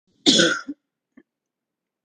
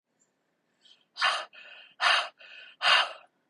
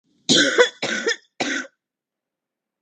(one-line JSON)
{"cough_length": "2.0 s", "cough_amplitude": 32768, "cough_signal_mean_std_ratio": 0.32, "exhalation_length": "3.5 s", "exhalation_amplitude": 13801, "exhalation_signal_mean_std_ratio": 0.38, "three_cough_length": "2.8 s", "three_cough_amplitude": 30934, "three_cough_signal_mean_std_ratio": 0.42, "survey_phase": "beta (2021-08-13 to 2022-03-07)", "age": "45-64", "gender": "Female", "wearing_mask": "No", "symptom_none": true, "smoker_status": "Current smoker (11 or more cigarettes per day)", "respiratory_condition_asthma": false, "respiratory_condition_other": false, "recruitment_source": "REACT", "submission_delay": "0 days", "covid_test_result": "Negative", "covid_test_method": "RT-qPCR", "influenza_a_test_result": "Negative", "influenza_b_test_result": "Negative"}